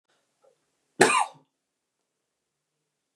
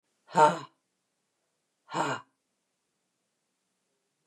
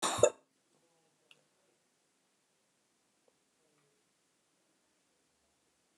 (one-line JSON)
{"three_cough_length": "3.2 s", "three_cough_amplitude": 25445, "three_cough_signal_mean_std_ratio": 0.21, "exhalation_length": "4.3 s", "exhalation_amplitude": 15059, "exhalation_signal_mean_std_ratio": 0.23, "cough_length": "6.0 s", "cough_amplitude": 9945, "cough_signal_mean_std_ratio": 0.14, "survey_phase": "beta (2021-08-13 to 2022-03-07)", "age": "65+", "gender": "Female", "wearing_mask": "No", "symptom_none": true, "smoker_status": "Ex-smoker", "respiratory_condition_asthma": false, "respiratory_condition_other": false, "recruitment_source": "REACT", "submission_delay": "2 days", "covid_test_result": "Negative", "covid_test_method": "RT-qPCR"}